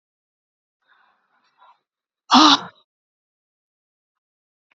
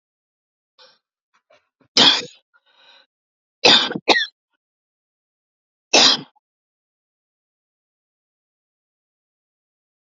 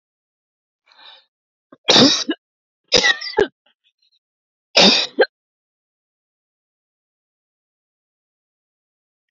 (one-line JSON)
{"exhalation_length": "4.8 s", "exhalation_amplitude": 32768, "exhalation_signal_mean_std_ratio": 0.19, "three_cough_length": "10.1 s", "three_cough_amplitude": 32768, "three_cough_signal_mean_std_ratio": 0.23, "cough_length": "9.3 s", "cough_amplitude": 32768, "cough_signal_mean_std_ratio": 0.26, "survey_phase": "beta (2021-08-13 to 2022-03-07)", "age": "45-64", "gender": "Female", "wearing_mask": "No", "symptom_new_continuous_cough": true, "smoker_status": "Never smoked", "respiratory_condition_asthma": true, "respiratory_condition_other": false, "recruitment_source": "REACT", "submission_delay": "6 days", "covid_test_result": "Negative", "covid_test_method": "RT-qPCR", "influenza_a_test_result": "Negative", "influenza_b_test_result": "Negative"}